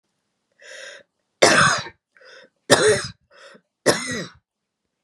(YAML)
three_cough_length: 5.0 s
three_cough_amplitude: 32768
three_cough_signal_mean_std_ratio: 0.36
survey_phase: beta (2021-08-13 to 2022-03-07)
age: 45-64
gender: Female
wearing_mask: 'No'
symptom_none: true
smoker_status: Never smoked
respiratory_condition_asthma: false
respiratory_condition_other: false
recruitment_source: REACT
submission_delay: 2 days
covid_test_result: Negative
covid_test_method: RT-qPCR